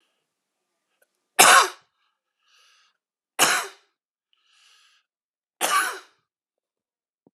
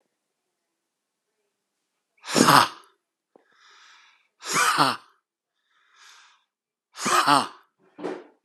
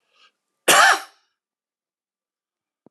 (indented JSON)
{
  "three_cough_length": "7.3 s",
  "three_cough_amplitude": 32767,
  "three_cough_signal_mean_std_ratio": 0.24,
  "exhalation_length": "8.4 s",
  "exhalation_amplitude": 30925,
  "exhalation_signal_mean_std_ratio": 0.3,
  "cough_length": "2.9 s",
  "cough_amplitude": 30700,
  "cough_signal_mean_std_ratio": 0.26,
  "survey_phase": "alpha (2021-03-01 to 2021-08-12)",
  "age": "45-64",
  "gender": "Male",
  "wearing_mask": "No",
  "symptom_none": true,
  "smoker_status": "Never smoked",
  "respiratory_condition_asthma": false,
  "respiratory_condition_other": false,
  "recruitment_source": "REACT",
  "submission_delay": "3 days",
  "covid_test_result": "Negative",
  "covid_test_method": "RT-qPCR"
}